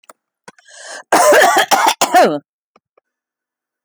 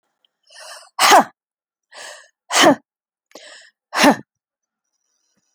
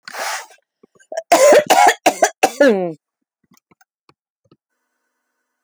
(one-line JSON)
{"cough_length": "3.8 s", "cough_amplitude": 32380, "cough_signal_mean_std_ratio": 0.47, "exhalation_length": "5.5 s", "exhalation_amplitude": 32768, "exhalation_signal_mean_std_ratio": 0.29, "three_cough_length": "5.6 s", "three_cough_amplitude": 31321, "three_cough_signal_mean_std_ratio": 0.38, "survey_phase": "alpha (2021-03-01 to 2021-08-12)", "age": "65+", "gender": "Female", "wearing_mask": "No", "symptom_none": true, "smoker_status": "Never smoked", "respiratory_condition_asthma": true, "respiratory_condition_other": false, "recruitment_source": "REACT", "submission_delay": "2 days", "covid_test_result": "Negative", "covid_test_method": "RT-qPCR"}